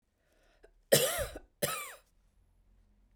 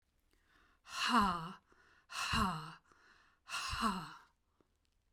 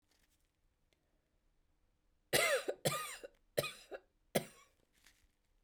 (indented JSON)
{
  "cough_length": "3.2 s",
  "cough_amplitude": 11668,
  "cough_signal_mean_std_ratio": 0.31,
  "exhalation_length": "5.1 s",
  "exhalation_amplitude": 3996,
  "exhalation_signal_mean_std_ratio": 0.45,
  "three_cough_length": "5.6 s",
  "three_cough_amplitude": 5347,
  "three_cough_signal_mean_std_ratio": 0.31,
  "survey_phase": "beta (2021-08-13 to 2022-03-07)",
  "age": "45-64",
  "gender": "Female",
  "wearing_mask": "No",
  "symptom_runny_or_blocked_nose": true,
  "symptom_change_to_sense_of_smell_or_taste": true,
  "symptom_other": true,
  "smoker_status": "Ex-smoker",
  "respiratory_condition_asthma": false,
  "respiratory_condition_other": false,
  "recruitment_source": "Test and Trace",
  "submission_delay": "1 day",
  "covid_test_method": "RT-qPCR",
  "covid_ct_value": 34.5,
  "covid_ct_gene": "N gene"
}